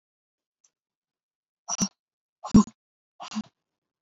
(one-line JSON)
{"exhalation_length": "4.0 s", "exhalation_amplitude": 16276, "exhalation_signal_mean_std_ratio": 0.19, "survey_phase": "beta (2021-08-13 to 2022-03-07)", "age": "18-44", "gender": "Female", "wearing_mask": "No", "symptom_sore_throat": true, "symptom_diarrhoea": true, "symptom_fatigue": true, "symptom_fever_high_temperature": true, "symptom_onset": "3 days", "smoker_status": "Never smoked", "respiratory_condition_asthma": false, "respiratory_condition_other": false, "recruitment_source": "Test and Trace", "submission_delay": "1 day", "covid_test_result": "Positive", "covid_test_method": "RT-qPCR", "covid_ct_value": 35.5, "covid_ct_gene": "N gene"}